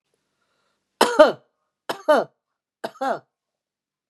{"three_cough_length": "4.1 s", "three_cough_amplitude": 32721, "three_cough_signal_mean_std_ratio": 0.27, "survey_phase": "beta (2021-08-13 to 2022-03-07)", "age": "45-64", "gender": "Female", "wearing_mask": "No", "symptom_none": true, "smoker_status": "Ex-smoker", "respiratory_condition_asthma": true, "respiratory_condition_other": false, "recruitment_source": "REACT", "submission_delay": "1 day", "covid_test_result": "Negative", "covid_test_method": "RT-qPCR", "influenza_a_test_result": "Negative", "influenza_b_test_result": "Negative"}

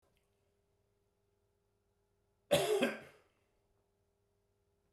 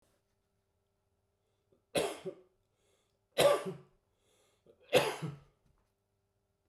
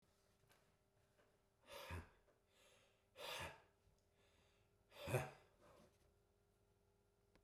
{"cough_length": "4.9 s", "cough_amplitude": 4556, "cough_signal_mean_std_ratio": 0.25, "three_cough_length": "6.7 s", "three_cough_amplitude": 6497, "three_cough_signal_mean_std_ratio": 0.27, "exhalation_length": "7.4 s", "exhalation_amplitude": 1300, "exhalation_signal_mean_std_ratio": 0.32, "survey_phase": "beta (2021-08-13 to 2022-03-07)", "age": "65+", "gender": "Male", "wearing_mask": "No", "symptom_cough_any": true, "smoker_status": "Never smoked", "respiratory_condition_asthma": false, "respiratory_condition_other": false, "recruitment_source": "REACT", "submission_delay": "2 days", "covid_test_result": "Positive", "covid_test_method": "RT-qPCR", "covid_ct_value": 36.0, "covid_ct_gene": "E gene", "influenza_a_test_result": "Negative", "influenza_b_test_result": "Negative"}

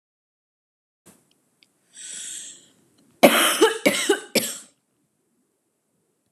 {"cough_length": "6.3 s", "cough_amplitude": 32764, "cough_signal_mean_std_ratio": 0.3, "survey_phase": "beta (2021-08-13 to 2022-03-07)", "age": "18-44", "gender": "Female", "wearing_mask": "No", "symptom_none": true, "symptom_onset": "7 days", "smoker_status": "Never smoked", "respiratory_condition_asthma": false, "respiratory_condition_other": false, "recruitment_source": "Test and Trace", "submission_delay": "2 days", "covid_test_result": "Positive", "covid_test_method": "RT-qPCR", "covid_ct_value": 28.1, "covid_ct_gene": "ORF1ab gene", "covid_ct_mean": 29.3, "covid_viral_load": "240 copies/ml", "covid_viral_load_category": "Minimal viral load (< 10K copies/ml)"}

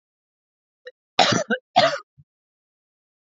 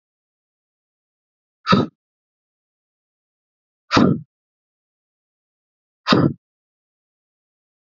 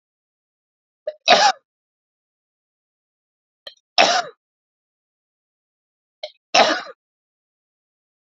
{"cough_length": "3.3 s", "cough_amplitude": 29739, "cough_signal_mean_std_ratio": 0.3, "exhalation_length": "7.9 s", "exhalation_amplitude": 32767, "exhalation_signal_mean_std_ratio": 0.22, "three_cough_length": "8.3 s", "three_cough_amplitude": 29448, "three_cough_signal_mean_std_ratio": 0.24, "survey_phase": "beta (2021-08-13 to 2022-03-07)", "age": "18-44", "gender": "Male", "wearing_mask": "No", "symptom_headache": true, "smoker_status": "Never smoked", "respiratory_condition_asthma": false, "respiratory_condition_other": false, "recruitment_source": "REACT", "submission_delay": "2 days", "covid_test_result": "Negative", "covid_test_method": "RT-qPCR"}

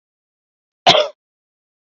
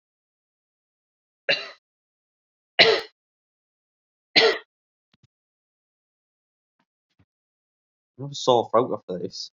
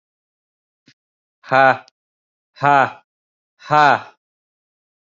{"cough_length": "2.0 s", "cough_amplitude": 29604, "cough_signal_mean_std_ratio": 0.24, "three_cough_length": "9.6 s", "three_cough_amplitude": 29686, "three_cough_signal_mean_std_ratio": 0.25, "exhalation_length": "5.0 s", "exhalation_amplitude": 30183, "exhalation_signal_mean_std_ratio": 0.29, "survey_phase": "beta (2021-08-13 to 2022-03-07)", "age": "18-44", "gender": "Male", "wearing_mask": "No", "symptom_runny_or_blocked_nose": true, "symptom_onset": "10 days", "smoker_status": "Current smoker (1 to 10 cigarettes per day)", "respiratory_condition_asthma": false, "respiratory_condition_other": false, "recruitment_source": "REACT", "submission_delay": "0 days", "covid_test_result": "Negative", "covid_test_method": "RT-qPCR", "influenza_a_test_result": "Negative", "influenza_b_test_result": "Negative"}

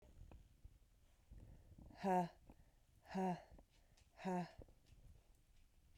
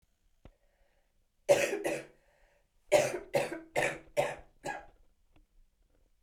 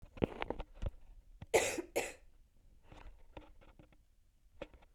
{"exhalation_length": "6.0 s", "exhalation_amplitude": 1135, "exhalation_signal_mean_std_ratio": 0.4, "three_cough_length": "6.2 s", "three_cough_amplitude": 8296, "three_cough_signal_mean_std_ratio": 0.36, "cough_length": "4.9 s", "cough_amplitude": 6004, "cough_signal_mean_std_ratio": 0.36, "survey_phase": "beta (2021-08-13 to 2022-03-07)", "age": "18-44", "gender": "Female", "wearing_mask": "Yes", "symptom_cough_any": true, "symptom_new_continuous_cough": true, "symptom_runny_or_blocked_nose": true, "symptom_diarrhoea": true, "symptom_fatigue": true, "symptom_fever_high_temperature": true, "symptom_headache": true, "symptom_change_to_sense_of_smell_or_taste": true, "symptom_loss_of_taste": true, "symptom_onset": "4 days", "smoker_status": "Never smoked", "respiratory_condition_asthma": false, "respiratory_condition_other": false, "recruitment_source": "Test and Trace", "submission_delay": "2 days", "covid_test_result": "Positive", "covid_test_method": "RT-qPCR", "covid_ct_value": 15.1, "covid_ct_gene": "ORF1ab gene", "covid_ct_mean": 15.5, "covid_viral_load": "8600000 copies/ml", "covid_viral_load_category": "High viral load (>1M copies/ml)"}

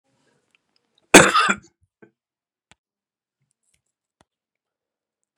{"cough_length": "5.4 s", "cough_amplitude": 32768, "cough_signal_mean_std_ratio": 0.18, "survey_phase": "beta (2021-08-13 to 2022-03-07)", "age": "45-64", "gender": "Male", "wearing_mask": "No", "symptom_cough_any": true, "symptom_runny_or_blocked_nose": true, "symptom_sore_throat": true, "symptom_fatigue": true, "symptom_change_to_sense_of_smell_or_taste": true, "symptom_loss_of_taste": true, "symptom_onset": "2 days", "smoker_status": "Never smoked", "respiratory_condition_asthma": false, "respiratory_condition_other": false, "recruitment_source": "Test and Trace", "submission_delay": "2 days", "covid_test_result": "Positive", "covid_test_method": "LAMP"}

